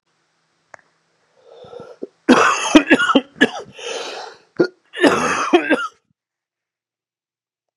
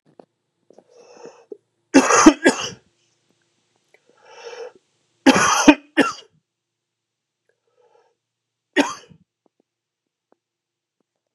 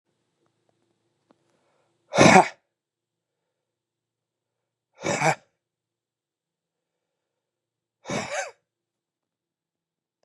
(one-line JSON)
{"cough_length": "7.8 s", "cough_amplitude": 32768, "cough_signal_mean_std_ratio": 0.38, "three_cough_length": "11.3 s", "three_cough_amplitude": 32768, "three_cough_signal_mean_std_ratio": 0.25, "exhalation_length": "10.2 s", "exhalation_amplitude": 32601, "exhalation_signal_mean_std_ratio": 0.19, "survey_phase": "beta (2021-08-13 to 2022-03-07)", "age": "45-64", "gender": "Male", "wearing_mask": "No", "symptom_cough_any": true, "symptom_runny_or_blocked_nose": true, "symptom_fatigue": true, "symptom_headache": true, "symptom_other": true, "symptom_onset": "3 days", "smoker_status": "Never smoked", "respiratory_condition_asthma": false, "respiratory_condition_other": false, "recruitment_source": "Test and Trace", "submission_delay": "1 day", "covid_test_result": "Positive", "covid_test_method": "RT-qPCR", "covid_ct_value": 17.0, "covid_ct_gene": "ORF1ab gene", "covid_ct_mean": 17.4, "covid_viral_load": "2000000 copies/ml", "covid_viral_load_category": "High viral load (>1M copies/ml)"}